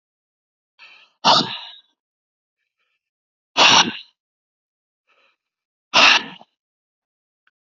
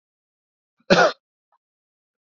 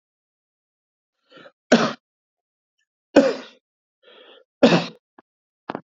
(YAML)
exhalation_length: 7.7 s
exhalation_amplitude: 32008
exhalation_signal_mean_std_ratio: 0.27
cough_length: 2.3 s
cough_amplitude: 27967
cough_signal_mean_std_ratio: 0.23
three_cough_length: 5.9 s
three_cough_amplitude: 32767
three_cough_signal_mean_std_ratio: 0.24
survey_phase: beta (2021-08-13 to 2022-03-07)
age: 65+
gender: Male
wearing_mask: 'No'
symptom_none: true
smoker_status: Ex-smoker
respiratory_condition_asthma: false
respiratory_condition_other: false
recruitment_source: REACT
submission_delay: 1 day
covid_test_result: Negative
covid_test_method: RT-qPCR
influenza_a_test_result: Negative
influenza_b_test_result: Negative